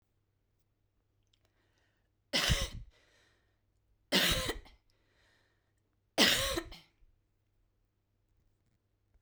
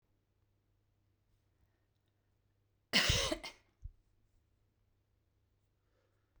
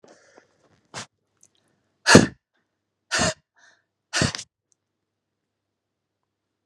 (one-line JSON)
{"three_cough_length": "9.2 s", "three_cough_amplitude": 8264, "three_cough_signal_mean_std_ratio": 0.29, "cough_length": "6.4 s", "cough_amplitude": 5819, "cough_signal_mean_std_ratio": 0.22, "exhalation_length": "6.7 s", "exhalation_amplitude": 32768, "exhalation_signal_mean_std_ratio": 0.2, "survey_phase": "beta (2021-08-13 to 2022-03-07)", "age": "45-64", "gender": "Female", "wearing_mask": "No", "symptom_runny_or_blocked_nose": true, "symptom_fatigue": true, "smoker_status": "Never smoked", "respiratory_condition_asthma": true, "respiratory_condition_other": false, "recruitment_source": "REACT", "submission_delay": "2 days", "covid_test_result": "Negative", "covid_test_method": "RT-qPCR"}